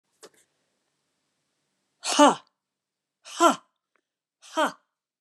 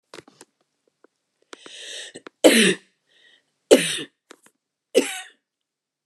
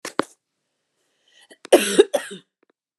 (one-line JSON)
{"exhalation_length": "5.2 s", "exhalation_amplitude": 20746, "exhalation_signal_mean_std_ratio": 0.23, "three_cough_length": "6.1 s", "three_cough_amplitude": 29204, "three_cough_signal_mean_std_ratio": 0.26, "cough_length": "3.0 s", "cough_amplitude": 29202, "cough_signal_mean_std_ratio": 0.25, "survey_phase": "beta (2021-08-13 to 2022-03-07)", "age": "45-64", "gender": "Female", "wearing_mask": "No", "symptom_cough_any": true, "symptom_runny_or_blocked_nose": true, "symptom_diarrhoea": true, "symptom_fatigue": true, "symptom_headache": true, "symptom_onset": "4 days", "smoker_status": "Never smoked", "respiratory_condition_asthma": false, "respiratory_condition_other": false, "recruitment_source": "Test and Trace", "submission_delay": "1 day", "covid_test_result": "Positive", "covid_test_method": "LAMP"}